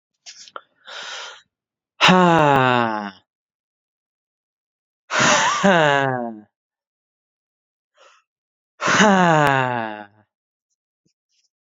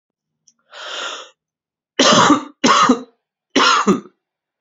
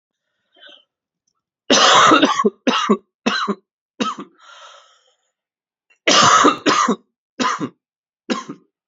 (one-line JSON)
{"exhalation_length": "11.6 s", "exhalation_amplitude": 30376, "exhalation_signal_mean_std_ratio": 0.38, "three_cough_length": "4.6 s", "three_cough_amplitude": 32608, "three_cough_signal_mean_std_ratio": 0.45, "cough_length": "8.9 s", "cough_amplitude": 31029, "cough_signal_mean_std_ratio": 0.43, "survey_phase": "beta (2021-08-13 to 2022-03-07)", "age": "18-44", "gender": "Male", "wearing_mask": "No", "symptom_cough_any": true, "symptom_new_continuous_cough": true, "symptom_runny_or_blocked_nose": true, "symptom_fatigue": true, "symptom_fever_high_temperature": true, "symptom_headache": true, "symptom_change_to_sense_of_smell_or_taste": true, "symptom_loss_of_taste": true, "symptom_onset": "4 days", "smoker_status": "Never smoked", "respiratory_condition_asthma": false, "respiratory_condition_other": false, "recruitment_source": "Test and Trace", "submission_delay": "2 days", "covid_test_result": "Positive", "covid_test_method": "RT-qPCR"}